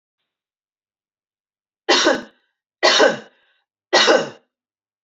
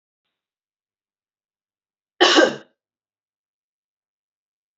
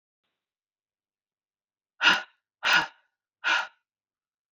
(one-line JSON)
{"three_cough_length": "5.0 s", "three_cough_amplitude": 28037, "three_cough_signal_mean_std_ratio": 0.35, "cough_length": "4.8 s", "cough_amplitude": 29726, "cough_signal_mean_std_ratio": 0.2, "exhalation_length": "4.5 s", "exhalation_amplitude": 15100, "exhalation_signal_mean_std_ratio": 0.28, "survey_phase": "beta (2021-08-13 to 2022-03-07)", "age": "45-64", "gender": "Female", "wearing_mask": "No", "symptom_runny_or_blocked_nose": true, "smoker_status": "Never smoked", "respiratory_condition_asthma": false, "respiratory_condition_other": false, "recruitment_source": "REACT", "submission_delay": "2 days", "covid_test_result": "Negative", "covid_test_method": "RT-qPCR", "influenza_a_test_result": "Negative", "influenza_b_test_result": "Negative"}